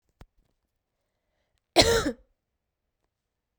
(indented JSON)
{
  "cough_length": "3.6 s",
  "cough_amplitude": 25908,
  "cough_signal_mean_std_ratio": 0.23,
  "survey_phase": "beta (2021-08-13 to 2022-03-07)",
  "age": "18-44",
  "gender": "Female",
  "wearing_mask": "No",
  "symptom_cough_any": true,
  "symptom_diarrhoea": true,
  "symptom_fatigue": true,
  "symptom_headache": true,
  "symptom_change_to_sense_of_smell_or_taste": true,
  "symptom_loss_of_taste": true,
  "symptom_other": true,
  "symptom_onset": "5 days",
  "smoker_status": "Never smoked",
  "respiratory_condition_asthma": false,
  "respiratory_condition_other": false,
  "recruitment_source": "Test and Trace",
  "submission_delay": "1 day",
  "covid_test_result": "Positive",
  "covid_test_method": "RT-qPCR",
  "covid_ct_value": 19.6,
  "covid_ct_gene": "ORF1ab gene",
  "covid_ct_mean": 21.0,
  "covid_viral_load": "130000 copies/ml",
  "covid_viral_load_category": "Low viral load (10K-1M copies/ml)"
}